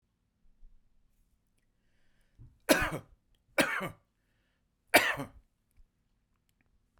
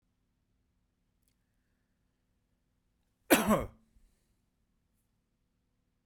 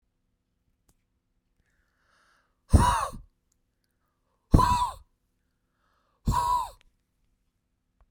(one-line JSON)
{"three_cough_length": "7.0 s", "three_cough_amplitude": 14161, "three_cough_signal_mean_std_ratio": 0.24, "cough_length": "6.1 s", "cough_amplitude": 12909, "cough_signal_mean_std_ratio": 0.18, "exhalation_length": "8.1 s", "exhalation_amplitude": 25370, "exhalation_signal_mean_std_ratio": 0.28, "survey_phase": "beta (2021-08-13 to 2022-03-07)", "age": "45-64", "gender": "Male", "wearing_mask": "No", "symptom_none": true, "smoker_status": "Ex-smoker", "respiratory_condition_asthma": false, "respiratory_condition_other": false, "recruitment_source": "REACT", "submission_delay": "1 day", "covid_test_result": "Negative", "covid_test_method": "RT-qPCR"}